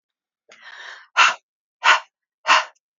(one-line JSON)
{"exhalation_length": "3.0 s", "exhalation_amplitude": 28719, "exhalation_signal_mean_std_ratio": 0.33, "survey_phase": "alpha (2021-03-01 to 2021-08-12)", "age": "45-64", "gender": "Female", "wearing_mask": "No", "symptom_none": true, "smoker_status": "Current smoker (1 to 10 cigarettes per day)", "respiratory_condition_asthma": false, "respiratory_condition_other": false, "recruitment_source": "REACT", "submission_delay": "1 day", "covid_test_result": "Negative", "covid_test_method": "RT-qPCR"}